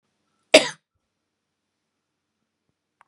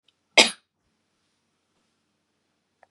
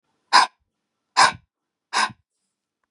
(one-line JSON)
{"cough_length": "3.1 s", "cough_amplitude": 32768, "cough_signal_mean_std_ratio": 0.13, "three_cough_length": "2.9 s", "three_cough_amplitude": 32731, "three_cough_signal_mean_std_ratio": 0.14, "exhalation_length": "2.9 s", "exhalation_amplitude": 32077, "exhalation_signal_mean_std_ratio": 0.28, "survey_phase": "beta (2021-08-13 to 2022-03-07)", "age": "45-64", "gender": "Female", "wearing_mask": "No", "symptom_none": true, "smoker_status": "Never smoked", "respiratory_condition_asthma": false, "respiratory_condition_other": false, "recruitment_source": "REACT", "submission_delay": "2 days", "covid_test_result": "Negative", "covid_test_method": "RT-qPCR", "covid_ct_value": 37.0, "covid_ct_gene": "N gene", "influenza_a_test_result": "Negative", "influenza_b_test_result": "Negative"}